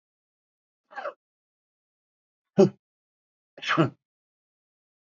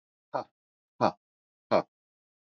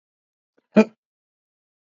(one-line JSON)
{"three_cough_length": "5.0 s", "three_cough_amplitude": 17217, "three_cough_signal_mean_std_ratio": 0.2, "exhalation_length": "2.5 s", "exhalation_amplitude": 12149, "exhalation_signal_mean_std_ratio": 0.23, "cough_length": "2.0 s", "cough_amplitude": 26005, "cough_signal_mean_std_ratio": 0.15, "survey_phase": "beta (2021-08-13 to 2022-03-07)", "age": "45-64", "gender": "Male", "wearing_mask": "No", "symptom_none": true, "smoker_status": "Never smoked", "respiratory_condition_asthma": false, "respiratory_condition_other": false, "recruitment_source": "REACT", "submission_delay": "2 days", "covid_test_result": "Negative", "covid_test_method": "RT-qPCR"}